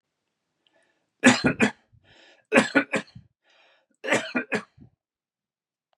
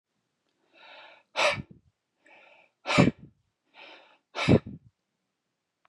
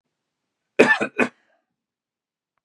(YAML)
three_cough_length: 6.0 s
three_cough_amplitude: 27835
three_cough_signal_mean_std_ratio: 0.3
exhalation_length: 5.9 s
exhalation_amplitude: 15517
exhalation_signal_mean_std_ratio: 0.26
cough_length: 2.6 s
cough_amplitude: 32768
cough_signal_mean_std_ratio: 0.25
survey_phase: beta (2021-08-13 to 2022-03-07)
age: 18-44
gender: Male
wearing_mask: 'No'
symptom_none: true
smoker_status: Never smoked
respiratory_condition_asthma: false
respiratory_condition_other: false
recruitment_source: REACT
submission_delay: 1 day
covid_test_result: Negative
covid_test_method: RT-qPCR